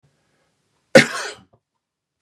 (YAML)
cough_length: 2.2 s
cough_amplitude: 32768
cough_signal_mean_std_ratio: 0.2
survey_phase: beta (2021-08-13 to 2022-03-07)
age: 45-64
gender: Male
wearing_mask: 'No'
symptom_none: true
smoker_status: Never smoked
respiratory_condition_asthma: false
respiratory_condition_other: false
recruitment_source: REACT
submission_delay: 2 days
covid_test_result: Negative
covid_test_method: RT-qPCR
influenza_a_test_result: Negative
influenza_b_test_result: Negative